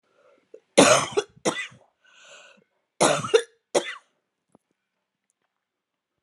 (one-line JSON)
{"cough_length": "6.2 s", "cough_amplitude": 29568, "cough_signal_mean_std_ratio": 0.28, "survey_phase": "alpha (2021-03-01 to 2021-08-12)", "age": "45-64", "gender": "Female", "wearing_mask": "No", "symptom_diarrhoea": true, "symptom_headache": true, "symptom_change_to_sense_of_smell_or_taste": true, "smoker_status": "Ex-smoker", "respiratory_condition_asthma": false, "respiratory_condition_other": false, "recruitment_source": "REACT", "submission_delay": "7 days", "covid_test_result": "Negative", "covid_test_method": "RT-qPCR"}